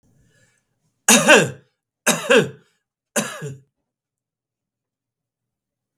three_cough_length: 6.0 s
three_cough_amplitude: 32768
three_cough_signal_mean_std_ratio: 0.28
survey_phase: beta (2021-08-13 to 2022-03-07)
age: 45-64
gender: Male
wearing_mask: 'No'
symptom_none: true
smoker_status: Ex-smoker
respiratory_condition_asthma: false
respiratory_condition_other: false
recruitment_source: REACT
submission_delay: 22 days
covid_test_result: Negative
covid_test_method: RT-qPCR
influenza_a_test_result: Negative
influenza_b_test_result: Negative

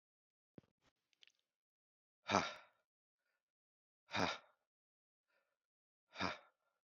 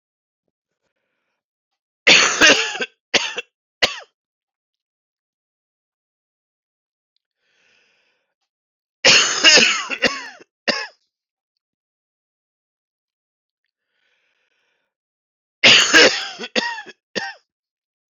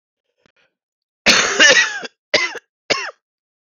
exhalation_length: 7.0 s
exhalation_amplitude: 4879
exhalation_signal_mean_std_ratio: 0.21
three_cough_length: 18.1 s
three_cough_amplitude: 30768
three_cough_signal_mean_std_ratio: 0.29
cough_length: 3.8 s
cough_amplitude: 30489
cough_signal_mean_std_ratio: 0.4
survey_phase: beta (2021-08-13 to 2022-03-07)
age: 45-64
gender: Male
wearing_mask: 'No'
symptom_cough_any: true
symptom_new_continuous_cough: true
symptom_runny_or_blocked_nose: true
symptom_shortness_of_breath: true
symptom_sore_throat: true
symptom_headache: true
symptom_onset: 3 days
smoker_status: Never smoked
respiratory_condition_asthma: false
respiratory_condition_other: false
recruitment_source: Test and Trace
submission_delay: 1 day
covid_test_result: Positive
covid_test_method: RT-qPCR
covid_ct_value: 17.9
covid_ct_gene: S gene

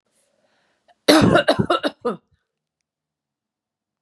cough_length: 4.0 s
cough_amplitude: 32528
cough_signal_mean_std_ratio: 0.33
survey_phase: beta (2021-08-13 to 2022-03-07)
age: 65+
gender: Female
wearing_mask: 'No'
symptom_none: true
smoker_status: Ex-smoker
respiratory_condition_asthma: false
respiratory_condition_other: false
recruitment_source: REACT
submission_delay: 4 days
covid_test_result: Negative
covid_test_method: RT-qPCR
influenza_a_test_result: Negative
influenza_b_test_result: Negative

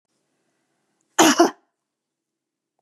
cough_length: 2.8 s
cough_amplitude: 30744
cough_signal_mean_std_ratio: 0.24
survey_phase: beta (2021-08-13 to 2022-03-07)
age: 65+
gender: Female
wearing_mask: 'No'
symptom_none: true
smoker_status: Never smoked
respiratory_condition_asthma: false
respiratory_condition_other: true
recruitment_source: REACT
submission_delay: 1 day
covid_test_result: Negative
covid_test_method: RT-qPCR
influenza_a_test_result: Negative
influenza_b_test_result: Negative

